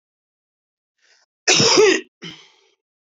{"cough_length": "3.1 s", "cough_amplitude": 28051, "cough_signal_mean_std_ratio": 0.35, "survey_phase": "beta (2021-08-13 to 2022-03-07)", "age": "45-64", "gender": "Female", "wearing_mask": "No", "symptom_change_to_sense_of_smell_or_taste": true, "symptom_onset": "5 days", "smoker_status": "Ex-smoker", "respiratory_condition_asthma": false, "respiratory_condition_other": false, "recruitment_source": "Test and Trace", "submission_delay": "2 days", "covid_test_result": "Positive", "covid_test_method": "RT-qPCR", "covid_ct_value": 21.4, "covid_ct_gene": "ORF1ab gene", "covid_ct_mean": 22.0, "covid_viral_load": "62000 copies/ml", "covid_viral_load_category": "Low viral load (10K-1M copies/ml)"}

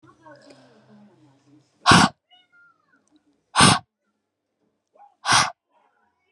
{"exhalation_length": "6.3 s", "exhalation_amplitude": 29437, "exhalation_signal_mean_std_ratio": 0.26, "survey_phase": "beta (2021-08-13 to 2022-03-07)", "age": "18-44", "gender": "Female", "wearing_mask": "No", "symptom_cough_any": true, "symptom_runny_or_blocked_nose": true, "symptom_diarrhoea": true, "symptom_fatigue": true, "symptom_change_to_sense_of_smell_or_taste": true, "symptom_onset": "4 days", "smoker_status": "Never smoked", "respiratory_condition_asthma": false, "respiratory_condition_other": false, "recruitment_source": "Test and Trace", "submission_delay": "2 days", "covid_test_result": "Positive", "covid_test_method": "RT-qPCR", "covid_ct_value": 17.3, "covid_ct_gene": "ORF1ab gene", "covid_ct_mean": 17.6, "covid_viral_load": "1600000 copies/ml", "covid_viral_load_category": "High viral load (>1M copies/ml)"}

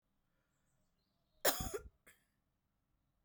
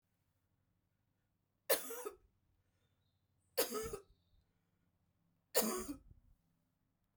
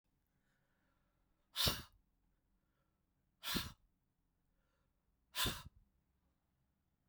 {"cough_length": "3.2 s", "cough_amplitude": 4395, "cough_signal_mean_std_ratio": 0.22, "three_cough_length": "7.2 s", "three_cough_amplitude": 4819, "three_cough_signal_mean_std_ratio": 0.28, "exhalation_length": "7.1 s", "exhalation_amplitude": 3025, "exhalation_signal_mean_std_ratio": 0.25, "survey_phase": "beta (2021-08-13 to 2022-03-07)", "age": "45-64", "gender": "Female", "wearing_mask": "No", "symptom_none": true, "symptom_onset": "12 days", "smoker_status": "Ex-smoker", "respiratory_condition_asthma": true, "respiratory_condition_other": false, "recruitment_source": "REACT", "submission_delay": "2 days", "covid_test_result": "Negative", "covid_test_method": "RT-qPCR"}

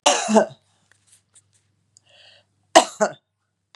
{"cough_length": "3.8 s", "cough_amplitude": 32768, "cough_signal_mean_std_ratio": 0.28, "survey_phase": "beta (2021-08-13 to 2022-03-07)", "age": "65+", "gender": "Female", "wearing_mask": "No", "symptom_none": true, "smoker_status": "Never smoked", "respiratory_condition_asthma": false, "respiratory_condition_other": false, "recruitment_source": "REACT", "submission_delay": "2 days", "covid_test_result": "Negative", "covid_test_method": "RT-qPCR", "influenza_a_test_result": "Negative", "influenza_b_test_result": "Negative"}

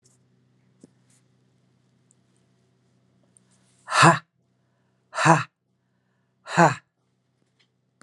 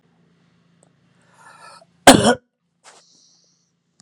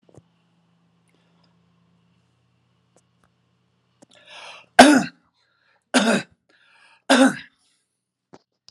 {"exhalation_length": "8.0 s", "exhalation_amplitude": 31146, "exhalation_signal_mean_std_ratio": 0.22, "cough_length": "4.0 s", "cough_amplitude": 32768, "cough_signal_mean_std_ratio": 0.19, "three_cough_length": "8.7 s", "three_cough_amplitude": 32768, "three_cough_signal_mean_std_ratio": 0.22, "survey_phase": "alpha (2021-03-01 to 2021-08-12)", "age": "45-64", "gender": "Male", "wearing_mask": "No", "symptom_none": true, "smoker_status": "Never smoked", "respiratory_condition_asthma": false, "respiratory_condition_other": false, "recruitment_source": "REACT", "submission_delay": "2 days", "covid_test_result": "Negative", "covid_test_method": "RT-qPCR"}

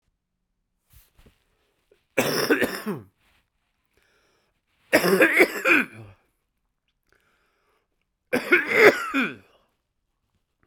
{"three_cough_length": "10.7 s", "three_cough_amplitude": 32767, "three_cough_signal_mean_std_ratio": 0.34, "survey_phase": "beta (2021-08-13 to 2022-03-07)", "age": "45-64", "gender": "Male", "wearing_mask": "No", "symptom_cough_any": true, "symptom_shortness_of_breath": true, "symptom_fatigue": true, "symptom_fever_high_temperature": true, "symptom_headache": true, "symptom_change_to_sense_of_smell_or_taste": true, "symptom_onset": "3 days", "smoker_status": "Never smoked", "respiratory_condition_asthma": true, "respiratory_condition_other": false, "recruitment_source": "Test and Trace", "submission_delay": "1 day", "covid_test_result": "Positive", "covid_test_method": "RT-qPCR", "covid_ct_value": 18.0, "covid_ct_gene": "ORF1ab gene"}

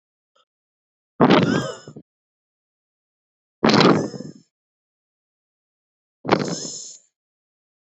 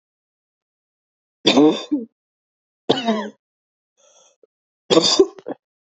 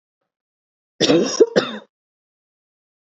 {"exhalation_length": "7.9 s", "exhalation_amplitude": 32138, "exhalation_signal_mean_std_ratio": 0.31, "three_cough_length": "5.9 s", "three_cough_amplitude": 29340, "three_cough_signal_mean_std_ratio": 0.33, "cough_length": "3.2 s", "cough_amplitude": 27430, "cough_signal_mean_std_ratio": 0.31, "survey_phase": "beta (2021-08-13 to 2022-03-07)", "age": "18-44", "gender": "Female", "wearing_mask": "No", "symptom_cough_any": true, "symptom_runny_or_blocked_nose": true, "symptom_sore_throat": true, "symptom_abdominal_pain": true, "symptom_fatigue": true, "symptom_headache": true, "symptom_onset": "3 days", "smoker_status": "Current smoker (1 to 10 cigarettes per day)", "respiratory_condition_asthma": false, "respiratory_condition_other": false, "recruitment_source": "Test and Trace", "submission_delay": "1 day", "covid_test_result": "Positive", "covid_test_method": "RT-qPCR", "covid_ct_value": 32.5, "covid_ct_gene": "N gene"}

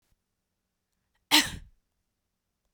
{"cough_length": "2.7 s", "cough_amplitude": 14819, "cough_signal_mean_std_ratio": 0.19, "survey_phase": "beta (2021-08-13 to 2022-03-07)", "age": "18-44", "gender": "Female", "wearing_mask": "No", "symptom_sore_throat": true, "symptom_onset": "2 days", "smoker_status": "Never smoked", "respiratory_condition_asthma": false, "respiratory_condition_other": false, "recruitment_source": "Test and Trace", "submission_delay": "1 day", "covid_test_result": "Positive", "covid_test_method": "RT-qPCR", "covid_ct_value": 25.5, "covid_ct_gene": "ORF1ab gene", "covid_ct_mean": 28.8, "covid_viral_load": "360 copies/ml", "covid_viral_load_category": "Minimal viral load (< 10K copies/ml)"}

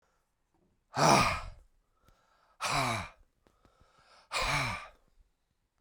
{"exhalation_length": "5.8 s", "exhalation_amplitude": 10011, "exhalation_signal_mean_std_ratio": 0.38, "survey_phase": "beta (2021-08-13 to 2022-03-07)", "age": "45-64", "gender": "Male", "wearing_mask": "No", "symptom_cough_any": true, "symptom_runny_or_blocked_nose": true, "symptom_abdominal_pain": true, "symptom_fatigue": true, "symptom_headache": true, "symptom_change_to_sense_of_smell_or_taste": true, "symptom_loss_of_taste": true, "symptom_onset": "4 days", "smoker_status": "Ex-smoker", "respiratory_condition_asthma": false, "respiratory_condition_other": true, "recruitment_source": "Test and Trace", "submission_delay": "1 day", "covid_test_result": "Positive", "covid_test_method": "RT-qPCR", "covid_ct_value": 14.8, "covid_ct_gene": "ORF1ab gene", "covid_ct_mean": 15.3, "covid_viral_load": "9700000 copies/ml", "covid_viral_load_category": "High viral load (>1M copies/ml)"}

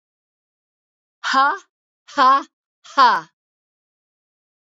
{"exhalation_length": "4.8 s", "exhalation_amplitude": 26823, "exhalation_signal_mean_std_ratio": 0.33, "survey_phase": "beta (2021-08-13 to 2022-03-07)", "age": "65+", "gender": "Female", "wearing_mask": "No", "symptom_headache": true, "smoker_status": "Never smoked", "respiratory_condition_asthma": false, "respiratory_condition_other": false, "recruitment_source": "REACT", "submission_delay": "1 day", "covid_test_result": "Negative", "covid_test_method": "RT-qPCR", "influenza_a_test_result": "Negative", "influenza_b_test_result": "Negative"}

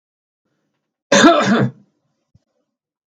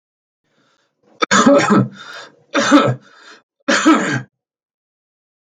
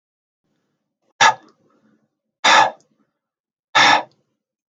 {"cough_length": "3.1 s", "cough_amplitude": 32768, "cough_signal_mean_std_ratio": 0.35, "three_cough_length": "5.5 s", "three_cough_amplitude": 32768, "three_cough_signal_mean_std_ratio": 0.43, "exhalation_length": "4.7 s", "exhalation_amplitude": 32215, "exhalation_signal_mean_std_ratio": 0.3, "survey_phase": "beta (2021-08-13 to 2022-03-07)", "age": "18-44", "gender": "Male", "wearing_mask": "No", "symptom_none": true, "smoker_status": "Current smoker (11 or more cigarettes per day)", "respiratory_condition_asthma": false, "respiratory_condition_other": false, "recruitment_source": "REACT", "submission_delay": "6 days", "covid_test_result": "Negative", "covid_test_method": "RT-qPCR", "influenza_a_test_result": "Negative", "influenza_b_test_result": "Negative"}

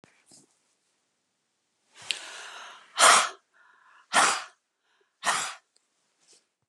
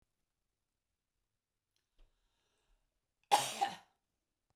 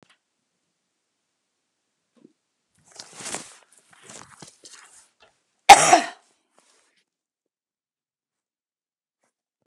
{"exhalation_length": "6.7 s", "exhalation_amplitude": 22118, "exhalation_signal_mean_std_ratio": 0.28, "three_cough_length": "4.6 s", "three_cough_amplitude": 6665, "three_cough_signal_mean_std_ratio": 0.19, "cough_length": "9.7 s", "cough_amplitude": 32768, "cough_signal_mean_std_ratio": 0.14, "survey_phase": "beta (2021-08-13 to 2022-03-07)", "age": "45-64", "gender": "Female", "wearing_mask": "No", "symptom_cough_any": true, "smoker_status": "Ex-smoker", "respiratory_condition_asthma": true, "respiratory_condition_other": false, "recruitment_source": "REACT", "submission_delay": "2 days", "covid_test_result": "Negative", "covid_test_method": "RT-qPCR"}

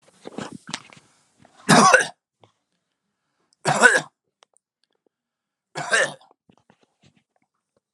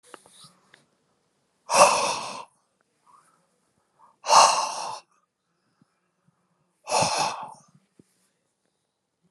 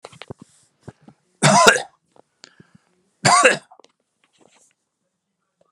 {"three_cough_length": "7.9 s", "three_cough_amplitude": 32767, "three_cough_signal_mean_std_ratio": 0.27, "exhalation_length": "9.3 s", "exhalation_amplitude": 25661, "exhalation_signal_mean_std_ratio": 0.3, "cough_length": "5.7 s", "cough_amplitude": 32768, "cough_signal_mean_std_ratio": 0.28, "survey_phase": "alpha (2021-03-01 to 2021-08-12)", "age": "65+", "gender": "Male", "wearing_mask": "No", "symptom_none": true, "smoker_status": "Never smoked", "respiratory_condition_asthma": false, "respiratory_condition_other": false, "recruitment_source": "REACT", "submission_delay": "3 days", "covid_test_result": "Negative", "covid_test_method": "RT-qPCR"}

